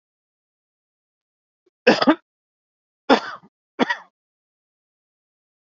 {"three_cough_length": "5.7 s", "three_cough_amplitude": 28254, "three_cough_signal_mean_std_ratio": 0.21, "survey_phase": "alpha (2021-03-01 to 2021-08-12)", "age": "18-44", "gender": "Male", "wearing_mask": "No", "symptom_cough_any": true, "symptom_fatigue": true, "symptom_headache": true, "symptom_change_to_sense_of_smell_or_taste": true, "symptom_onset": "4 days", "smoker_status": "Never smoked", "respiratory_condition_asthma": false, "respiratory_condition_other": false, "recruitment_source": "Test and Trace", "submission_delay": "2 days", "covid_test_result": "Positive", "covid_test_method": "RT-qPCR", "covid_ct_value": 17.4, "covid_ct_gene": "N gene", "covid_ct_mean": 17.8, "covid_viral_load": "1500000 copies/ml", "covid_viral_load_category": "High viral load (>1M copies/ml)"}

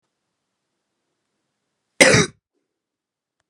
{"cough_length": "3.5 s", "cough_amplitude": 32768, "cough_signal_mean_std_ratio": 0.21, "survey_phase": "beta (2021-08-13 to 2022-03-07)", "age": "18-44", "gender": "Female", "wearing_mask": "No", "symptom_none": true, "smoker_status": "Current smoker (1 to 10 cigarettes per day)", "respiratory_condition_asthma": false, "respiratory_condition_other": false, "recruitment_source": "REACT", "submission_delay": "2 days", "covid_test_result": "Negative", "covid_test_method": "RT-qPCR", "influenza_a_test_result": "Negative", "influenza_b_test_result": "Negative"}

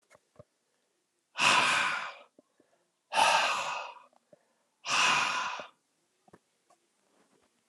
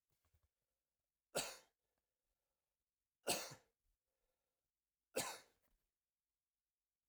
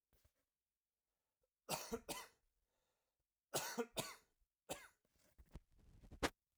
{"exhalation_length": "7.7 s", "exhalation_amplitude": 11965, "exhalation_signal_mean_std_ratio": 0.43, "three_cough_length": "7.1 s", "three_cough_amplitude": 1885, "three_cough_signal_mean_std_ratio": 0.22, "cough_length": "6.6 s", "cough_amplitude": 1979, "cough_signal_mean_std_ratio": 0.31, "survey_phase": "alpha (2021-03-01 to 2021-08-12)", "age": "18-44", "gender": "Male", "wearing_mask": "No", "symptom_new_continuous_cough": true, "symptom_fever_high_temperature": true, "symptom_headache": true, "symptom_change_to_sense_of_smell_or_taste": true, "symptom_loss_of_taste": true, "symptom_onset": "3 days", "smoker_status": "Never smoked", "respiratory_condition_asthma": false, "respiratory_condition_other": false, "recruitment_source": "Test and Trace", "submission_delay": "2 days", "covid_test_result": "Positive", "covid_test_method": "RT-qPCR", "covid_ct_value": 13.6, "covid_ct_gene": "ORF1ab gene", "covid_ct_mean": 14.2, "covid_viral_load": "22000000 copies/ml", "covid_viral_load_category": "High viral load (>1M copies/ml)"}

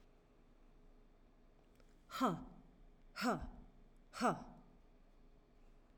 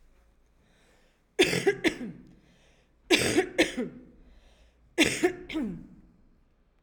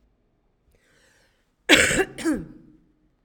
{"exhalation_length": "6.0 s", "exhalation_amplitude": 2430, "exhalation_signal_mean_std_ratio": 0.38, "three_cough_length": "6.8 s", "three_cough_amplitude": 17916, "three_cough_signal_mean_std_ratio": 0.39, "cough_length": "3.2 s", "cough_amplitude": 32767, "cough_signal_mean_std_ratio": 0.32, "survey_phase": "beta (2021-08-13 to 2022-03-07)", "age": "45-64", "gender": "Female", "wearing_mask": "No", "symptom_headache": true, "symptom_onset": "6 days", "smoker_status": "Never smoked", "respiratory_condition_asthma": true, "respiratory_condition_other": false, "recruitment_source": "REACT", "submission_delay": "0 days", "covid_test_result": "Negative", "covid_test_method": "RT-qPCR", "influenza_a_test_result": "Unknown/Void", "influenza_b_test_result": "Unknown/Void"}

